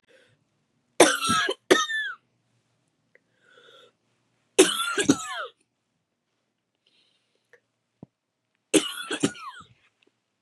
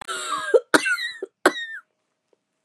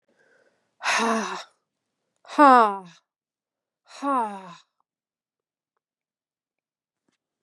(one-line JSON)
{"three_cough_length": "10.4 s", "three_cough_amplitude": 28091, "three_cough_signal_mean_std_ratio": 0.29, "cough_length": "2.6 s", "cough_amplitude": 32562, "cough_signal_mean_std_ratio": 0.41, "exhalation_length": "7.4 s", "exhalation_amplitude": 26272, "exhalation_signal_mean_std_ratio": 0.26, "survey_phase": "beta (2021-08-13 to 2022-03-07)", "age": "18-44", "gender": "Female", "wearing_mask": "No", "symptom_cough_any": true, "symptom_runny_or_blocked_nose": true, "symptom_sore_throat": true, "symptom_onset": "2 days", "smoker_status": "Never smoked", "respiratory_condition_asthma": false, "respiratory_condition_other": false, "recruitment_source": "Test and Trace", "submission_delay": "2 days", "covid_test_result": "Positive", "covid_test_method": "RT-qPCR", "covid_ct_value": 20.2, "covid_ct_gene": "ORF1ab gene", "covid_ct_mean": 22.5, "covid_viral_load": "43000 copies/ml", "covid_viral_load_category": "Low viral load (10K-1M copies/ml)"}